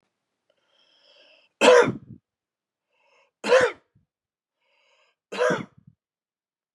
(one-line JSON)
{"three_cough_length": "6.7 s", "three_cough_amplitude": 25334, "three_cough_signal_mean_std_ratio": 0.26, "survey_phase": "beta (2021-08-13 to 2022-03-07)", "age": "45-64", "gender": "Male", "wearing_mask": "No", "symptom_runny_or_blocked_nose": true, "smoker_status": "Never smoked", "respiratory_condition_asthma": false, "respiratory_condition_other": false, "recruitment_source": "Test and Trace", "submission_delay": "2 days", "covid_test_result": "Positive", "covid_test_method": "ePCR"}